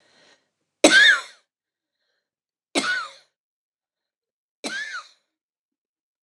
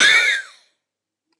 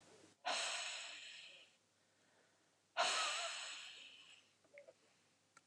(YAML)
three_cough_length: 6.2 s
three_cough_amplitude: 29204
three_cough_signal_mean_std_ratio: 0.26
cough_length: 1.4 s
cough_amplitude: 28639
cough_signal_mean_std_ratio: 0.46
exhalation_length: 5.7 s
exhalation_amplitude: 2077
exhalation_signal_mean_std_ratio: 0.48
survey_phase: beta (2021-08-13 to 2022-03-07)
age: 65+
gender: Female
wearing_mask: 'No'
symptom_runny_or_blocked_nose: true
symptom_onset: 4 days
smoker_status: Never smoked
respiratory_condition_asthma: false
respiratory_condition_other: false
recruitment_source: REACT
submission_delay: 1 day
covid_test_result: Negative
covid_test_method: RT-qPCR
influenza_a_test_result: Negative
influenza_b_test_result: Negative